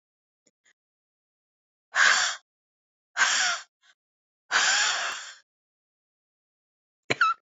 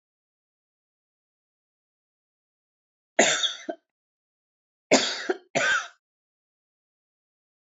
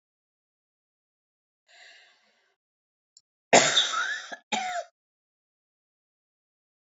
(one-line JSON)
{"exhalation_length": "7.5 s", "exhalation_amplitude": 19431, "exhalation_signal_mean_std_ratio": 0.38, "three_cough_length": "7.7 s", "three_cough_amplitude": 21745, "three_cough_signal_mean_std_ratio": 0.27, "cough_length": "6.9 s", "cough_amplitude": 21517, "cough_signal_mean_std_ratio": 0.25, "survey_phase": "beta (2021-08-13 to 2022-03-07)", "age": "45-64", "gender": "Female", "wearing_mask": "Yes", "symptom_cough_any": true, "symptom_runny_or_blocked_nose": true, "symptom_shortness_of_breath": true, "symptom_diarrhoea": true, "symptom_fatigue": true, "smoker_status": "Ex-smoker", "respiratory_condition_asthma": false, "respiratory_condition_other": false, "recruitment_source": "Test and Trace", "submission_delay": "2 days", "covid_test_result": "Positive", "covid_test_method": "RT-qPCR", "covid_ct_value": 34.8, "covid_ct_gene": "N gene", "covid_ct_mean": 34.9, "covid_viral_load": "3.6 copies/ml", "covid_viral_load_category": "Minimal viral load (< 10K copies/ml)"}